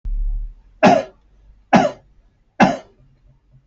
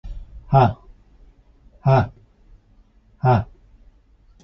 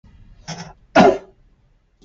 {"three_cough_length": "3.7 s", "three_cough_amplitude": 28033, "three_cough_signal_mean_std_ratio": 0.4, "exhalation_length": "4.4 s", "exhalation_amplitude": 27009, "exhalation_signal_mean_std_ratio": 0.34, "cough_length": "2.0 s", "cough_amplitude": 28313, "cough_signal_mean_std_ratio": 0.29, "survey_phase": "beta (2021-08-13 to 2022-03-07)", "age": "45-64", "gender": "Male", "wearing_mask": "No", "symptom_cough_any": true, "smoker_status": "Never smoked", "respiratory_condition_asthma": false, "respiratory_condition_other": false, "recruitment_source": "Test and Trace", "submission_delay": "0 days", "covid_test_result": "Negative", "covid_test_method": "LFT"}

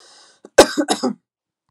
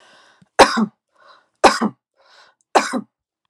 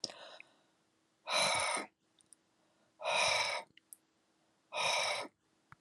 {"cough_length": "1.7 s", "cough_amplitude": 32768, "cough_signal_mean_std_ratio": 0.3, "three_cough_length": "3.5 s", "three_cough_amplitude": 32768, "three_cough_signal_mean_std_ratio": 0.3, "exhalation_length": "5.8 s", "exhalation_amplitude": 3769, "exhalation_signal_mean_std_ratio": 0.47, "survey_phase": "alpha (2021-03-01 to 2021-08-12)", "age": "18-44", "gender": "Female", "wearing_mask": "No", "symptom_none": true, "smoker_status": "Never smoked", "respiratory_condition_asthma": false, "respiratory_condition_other": false, "recruitment_source": "REACT", "submission_delay": "1 day", "covid_test_result": "Negative", "covid_test_method": "RT-qPCR"}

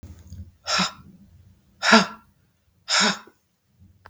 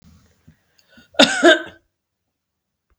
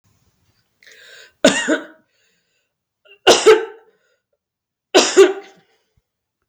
{"exhalation_length": "4.1 s", "exhalation_amplitude": 32681, "exhalation_signal_mean_std_ratio": 0.34, "cough_length": "3.0 s", "cough_amplitude": 32768, "cough_signal_mean_std_ratio": 0.26, "three_cough_length": "6.5 s", "three_cough_amplitude": 32768, "three_cough_signal_mean_std_ratio": 0.3, "survey_phase": "beta (2021-08-13 to 2022-03-07)", "age": "45-64", "gender": "Female", "wearing_mask": "No", "symptom_none": true, "smoker_status": "Never smoked", "respiratory_condition_asthma": true, "respiratory_condition_other": false, "recruitment_source": "Test and Trace", "submission_delay": "2 days", "covid_test_result": "Negative", "covid_test_method": "RT-qPCR"}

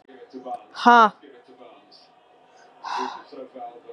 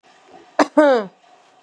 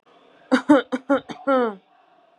{"exhalation_length": "3.9 s", "exhalation_amplitude": 30919, "exhalation_signal_mean_std_ratio": 0.29, "cough_length": "1.6 s", "cough_amplitude": 31564, "cough_signal_mean_std_ratio": 0.37, "three_cough_length": "2.4 s", "three_cough_amplitude": 21265, "three_cough_signal_mean_std_ratio": 0.42, "survey_phase": "beta (2021-08-13 to 2022-03-07)", "age": "18-44", "gender": "Female", "wearing_mask": "No", "symptom_none": true, "smoker_status": "Never smoked", "respiratory_condition_asthma": false, "respiratory_condition_other": false, "recruitment_source": "REACT", "submission_delay": "1 day", "covid_test_result": "Negative", "covid_test_method": "RT-qPCR", "influenza_a_test_result": "Negative", "influenza_b_test_result": "Negative"}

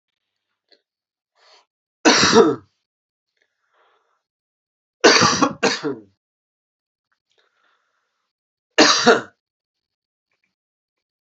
{"three_cough_length": "11.3 s", "three_cough_amplitude": 32175, "three_cough_signal_mean_std_ratio": 0.29, "survey_phase": "alpha (2021-03-01 to 2021-08-12)", "age": "45-64", "gender": "Male", "wearing_mask": "No", "symptom_cough_any": true, "symptom_fatigue": true, "symptom_change_to_sense_of_smell_or_taste": true, "symptom_onset": "7 days", "smoker_status": "Ex-smoker", "respiratory_condition_asthma": false, "respiratory_condition_other": false, "recruitment_source": "Test and Trace", "submission_delay": "1 day", "covid_test_result": "Positive", "covid_test_method": "RT-qPCR", "covid_ct_value": 24.4, "covid_ct_gene": "ORF1ab gene", "covid_ct_mean": 24.7, "covid_viral_load": "8100 copies/ml", "covid_viral_load_category": "Minimal viral load (< 10K copies/ml)"}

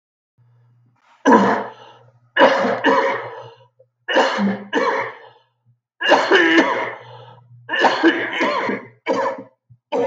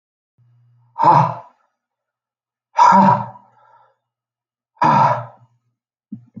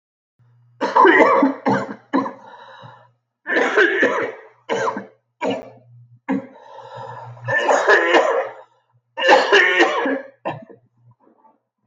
{"three_cough_length": "10.1 s", "three_cough_amplitude": 32768, "three_cough_signal_mean_std_ratio": 0.57, "exhalation_length": "6.4 s", "exhalation_amplitude": 32347, "exhalation_signal_mean_std_ratio": 0.36, "cough_length": "11.9 s", "cough_amplitude": 32768, "cough_signal_mean_std_ratio": 0.53, "survey_phase": "beta (2021-08-13 to 2022-03-07)", "age": "45-64", "gender": "Male", "wearing_mask": "No", "symptom_cough_any": true, "symptom_new_continuous_cough": true, "symptom_runny_or_blocked_nose": true, "symptom_sore_throat": true, "symptom_fever_high_temperature": true, "symptom_onset": "3 days", "smoker_status": "Never smoked", "respiratory_condition_asthma": true, "respiratory_condition_other": false, "recruitment_source": "Test and Trace", "submission_delay": "2 days", "covid_test_result": "Positive", "covid_test_method": "RT-qPCR", "covid_ct_value": 20.9, "covid_ct_gene": "N gene"}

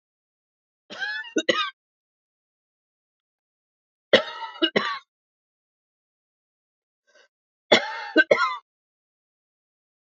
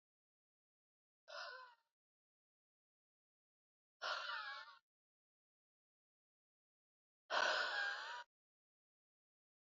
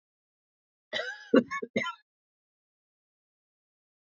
{"three_cough_length": "10.2 s", "three_cough_amplitude": 26904, "three_cough_signal_mean_std_ratio": 0.26, "exhalation_length": "9.6 s", "exhalation_amplitude": 2069, "exhalation_signal_mean_std_ratio": 0.32, "cough_length": "4.1 s", "cough_amplitude": 13120, "cough_signal_mean_std_ratio": 0.23, "survey_phase": "beta (2021-08-13 to 2022-03-07)", "age": "45-64", "gender": "Female", "wearing_mask": "No", "symptom_cough_any": true, "symptom_runny_or_blocked_nose": true, "symptom_shortness_of_breath": true, "symptom_fatigue": true, "symptom_headache": true, "symptom_other": true, "smoker_status": "Never smoked", "respiratory_condition_asthma": false, "respiratory_condition_other": false, "recruitment_source": "Test and Trace", "submission_delay": "2 days", "covid_test_result": "Positive", "covid_test_method": "LFT"}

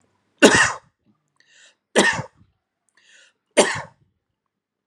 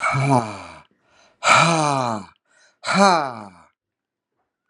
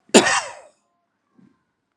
{"three_cough_length": "4.9 s", "three_cough_amplitude": 32768, "three_cough_signal_mean_std_ratio": 0.29, "exhalation_length": "4.7 s", "exhalation_amplitude": 30749, "exhalation_signal_mean_std_ratio": 0.46, "cough_length": "2.0 s", "cough_amplitude": 32767, "cough_signal_mean_std_ratio": 0.27, "survey_phase": "beta (2021-08-13 to 2022-03-07)", "age": "45-64", "gender": "Male", "wearing_mask": "No", "symptom_fatigue": true, "symptom_headache": true, "smoker_status": "Ex-smoker", "respiratory_condition_asthma": false, "respiratory_condition_other": false, "recruitment_source": "Test and Trace", "submission_delay": "-1 day", "covid_test_result": "Negative", "covid_test_method": "LFT"}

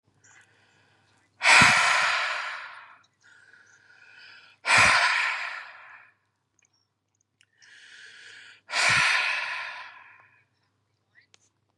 {"exhalation_length": "11.8 s", "exhalation_amplitude": 22341, "exhalation_signal_mean_std_ratio": 0.4, "survey_phase": "beta (2021-08-13 to 2022-03-07)", "age": "18-44", "gender": "Male", "wearing_mask": "No", "symptom_none": true, "symptom_onset": "8 days", "smoker_status": "Ex-smoker", "respiratory_condition_asthma": false, "respiratory_condition_other": false, "recruitment_source": "Test and Trace", "submission_delay": "1 day", "covid_test_result": "Positive", "covid_test_method": "ePCR"}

